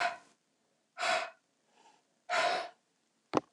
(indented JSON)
{
  "exhalation_length": "3.5 s",
  "exhalation_amplitude": 11394,
  "exhalation_signal_mean_std_ratio": 0.4,
  "survey_phase": "beta (2021-08-13 to 2022-03-07)",
  "age": "45-64",
  "gender": "Female",
  "wearing_mask": "No",
  "symptom_cough_any": true,
  "symptom_runny_or_blocked_nose": true,
  "symptom_sore_throat": true,
  "symptom_fatigue": true,
  "symptom_change_to_sense_of_smell_or_taste": true,
  "symptom_other": true,
  "symptom_onset": "4 days",
  "smoker_status": "Never smoked",
  "respiratory_condition_asthma": false,
  "respiratory_condition_other": false,
  "recruitment_source": "Test and Trace",
  "submission_delay": "2 days",
  "covid_test_result": "Positive",
  "covid_test_method": "RT-qPCR",
  "covid_ct_value": 23.5,
  "covid_ct_gene": "ORF1ab gene"
}